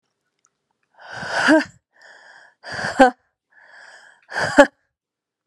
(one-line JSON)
{"exhalation_length": "5.5 s", "exhalation_amplitude": 32768, "exhalation_signal_mean_std_ratio": 0.29, "survey_phase": "beta (2021-08-13 to 2022-03-07)", "age": "18-44", "gender": "Female", "wearing_mask": "No", "symptom_cough_any": true, "symptom_runny_or_blocked_nose": true, "symptom_shortness_of_breath": true, "symptom_sore_throat": true, "symptom_abdominal_pain": true, "symptom_fatigue": true, "symptom_fever_high_temperature": true, "symptom_headache": true, "symptom_change_to_sense_of_smell_or_taste": true, "symptom_loss_of_taste": true, "symptom_other": true, "symptom_onset": "3 days", "smoker_status": "Ex-smoker", "respiratory_condition_asthma": false, "respiratory_condition_other": false, "recruitment_source": "Test and Trace", "submission_delay": "1 day", "covid_test_result": "Positive", "covid_test_method": "RT-qPCR", "covid_ct_value": 19.7, "covid_ct_gene": "ORF1ab gene"}